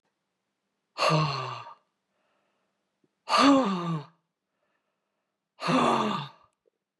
{"exhalation_length": "7.0 s", "exhalation_amplitude": 12570, "exhalation_signal_mean_std_ratio": 0.41, "survey_phase": "beta (2021-08-13 to 2022-03-07)", "age": "45-64", "gender": "Female", "wearing_mask": "No", "symptom_cough_any": true, "symptom_runny_or_blocked_nose": true, "symptom_shortness_of_breath": true, "symptom_sore_throat": true, "symptom_fatigue": true, "symptom_headache": true, "symptom_change_to_sense_of_smell_or_taste": true, "symptom_loss_of_taste": true, "symptom_other": true, "symptom_onset": "3 days", "smoker_status": "Ex-smoker", "respiratory_condition_asthma": true, "respiratory_condition_other": false, "recruitment_source": "Test and Trace", "submission_delay": "2 days", "covid_test_result": "Positive", "covid_test_method": "RT-qPCR", "covid_ct_value": 26.4, "covid_ct_gene": "ORF1ab gene"}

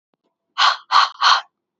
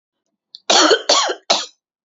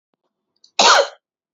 {"exhalation_length": "1.8 s", "exhalation_amplitude": 27976, "exhalation_signal_mean_std_ratio": 0.45, "three_cough_length": "2.0 s", "three_cough_amplitude": 30895, "three_cough_signal_mean_std_ratio": 0.47, "cough_length": "1.5 s", "cough_amplitude": 29926, "cough_signal_mean_std_ratio": 0.35, "survey_phase": "beta (2021-08-13 to 2022-03-07)", "age": "18-44", "gender": "Female", "wearing_mask": "No", "symptom_cough_any": true, "symptom_new_continuous_cough": true, "symptom_runny_or_blocked_nose": true, "symptom_shortness_of_breath": true, "symptom_sore_throat": true, "symptom_fatigue": true, "symptom_headache": true, "symptom_onset": "3 days", "smoker_status": "Never smoked", "respiratory_condition_asthma": true, "respiratory_condition_other": false, "recruitment_source": "Test and Trace", "submission_delay": "2 days", "covid_test_result": "Positive", "covid_test_method": "LAMP"}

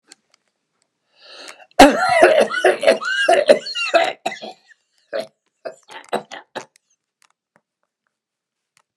{"exhalation_length": "9.0 s", "exhalation_amplitude": 32768, "exhalation_signal_mean_std_ratio": 0.36, "survey_phase": "beta (2021-08-13 to 2022-03-07)", "age": "65+", "gender": "Male", "wearing_mask": "No", "symptom_cough_any": true, "symptom_onset": "12 days", "smoker_status": "Never smoked", "respiratory_condition_asthma": true, "respiratory_condition_other": false, "recruitment_source": "REACT", "submission_delay": "2 days", "covid_test_result": "Negative", "covid_test_method": "RT-qPCR", "influenza_a_test_result": "Negative", "influenza_b_test_result": "Negative"}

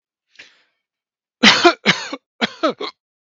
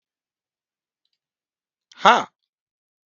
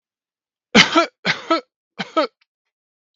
{"cough_length": "3.3 s", "cough_amplitude": 32768, "cough_signal_mean_std_ratio": 0.33, "exhalation_length": "3.2 s", "exhalation_amplitude": 32766, "exhalation_signal_mean_std_ratio": 0.16, "three_cough_length": "3.2 s", "three_cough_amplitude": 32768, "three_cough_signal_mean_std_ratio": 0.32, "survey_phase": "beta (2021-08-13 to 2022-03-07)", "age": "45-64", "gender": "Male", "wearing_mask": "No", "symptom_none": true, "smoker_status": "Never smoked", "respiratory_condition_asthma": false, "respiratory_condition_other": false, "recruitment_source": "REACT", "submission_delay": "1 day", "covid_test_result": "Negative", "covid_test_method": "RT-qPCR", "influenza_a_test_result": "Negative", "influenza_b_test_result": "Negative"}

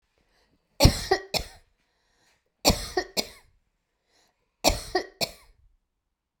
{"three_cough_length": "6.4 s", "three_cough_amplitude": 27779, "three_cough_signal_mean_std_ratio": 0.27, "survey_phase": "beta (2021-08-13 to 2022-03-07)", "age": "65+", "gender": "Female", "wearing_mask": "No", "symptom_none": true, "smoker_status": "Never smoked", "respiratory_condition_asthma": false, "respiratory_condition_other": false, "recruitment_source": "REACT", "submission_delay": "9 days", "covid_test_result": "Negative", "covid_test_method": "RT-qPCR"}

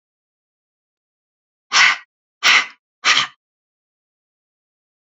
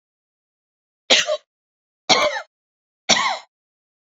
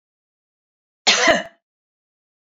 {"exhalation_length": "5.0 s", "exhalation_amplitude": 30556, "exhalation_signal_mean_std_ratio": 0.28, "three_cough_length": "4.0 s", "three_cough_amplitude": 30839, "three_cough_signal_mean_std_ratio": 0.34, "cough_length": "2.5 s", "cough_amplitude": 29166, "cough_signal_mean_std_ratio": 0.29, "survey_phase": "beta (2021-08-13 to 2022-03-07)", "age": "65+", "gender": "Female", "wearing_mask": "No", "symptom_none": true, "smoker_status": "Never smoked", "respiratory_condition_asthma": false, "respiratory_condition_other": false, "recruitment_source": "REACT", "submission_delay": "2 days", "covid_test_result": "Negative", "covid_test_method": "RT-qPCR", "influenza_a_test_result": "Negative", "influenza_b_test_result": "Negative"}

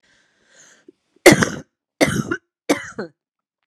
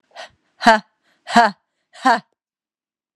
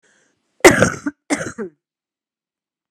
{"three_cough_length": "3.7 s", "three_cough_amplitude": 32768, "three_cough_signal_mean_std_ratio": 0.28, "exhalation_length": "3.2 s", "exhalation_amplitude": 32767, "exhalation_signal_mean_std_ratio": 0.29, "cough_length": "2.9 s", "cough_amplitude": 32768, "cough_signal_mean_std_ratio": 0.28, "survey_phase": "beta (2021-08-13 to 2022-03-07)", "age": "18-44", "gender": "Female", "wearing_mask": "No", "symptom_cough_any": true, "symptom_runny_or_blocked_nose": true, "symptom_sore_throat": true, "symptom_fatigue": true, "symptom_other": true, "smoker_status": "Never smoked", "respiratory_condition_asthma": false, "respiratory_condition_other": false, "recruitment_source": "Test and Trace", "submission_delay": "2 days", "covid_test_result": "Negative", "covid_test_method": "LFT"}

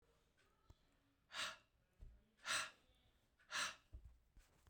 {"exhalation_length": "4.7 s", "exhalation_amplitude": 949, "exhalation_signal_mean_std_ratio": 0.37, "survey_phase": "beta (2021-08-13 to 2022-03-07)", "age": "45-64", "gender": "Male", "wearing_mask": "No", "symptom_none": true, "smoker_status": "Never smoked", "respiratory_condition_asthma": false, "respiratory_condition_other": false, "recruitment_source": "REACT", "submission_delay": "5 days", "covid_test_result": "Negative", "covid_test_method": "RT-qPCR"}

